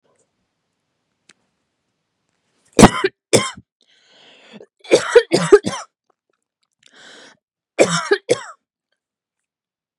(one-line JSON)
{"cough_length": "10.0 s", "cough_amplitude": 32768, "cough_signal_mean_std_ratio": 0.25, "survey_phase": "beta (2021-08-13 to 2022-03-07)", "age": "18-44", "gender": "Female", "wearing_mask": "No", "symptom_cough_any": true, "symptom_runny_or_blocked_nose": true, "symptom_fatigue": true, "smoker_status": "Never smoked", "respiratory_condition_asthma": false, "respiratory_condition_other": false, "recruitment_source": "REACT", "submission_delay": "2 days", "covid_test_result": "Negative", "covid_test_method": "RT-qPCR", "influenza_a_test_result": "Negative", "influenza_b_test_result": "Negative"}